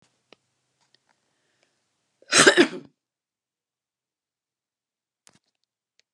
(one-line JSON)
{"cough_length": "6.1 s", "cough_amplitude": 30559, "cough_signal_mean_std_ratio": 0.18, "survey_phase": "beta (2021-08-13 to 2022-03-07)", "age": "45-64", "gender": "Female", "wearing_mask": "No", "symptom_none": true, "smoker_status": "Never smoked", "respiratory_condition_asthma": false, "respiratory_condition_other": false, "recruitment_source": "REACT", "submission_delay": "1 day", "covid_test_result": "Negative", "covid_test_method": "RT-qPCR"}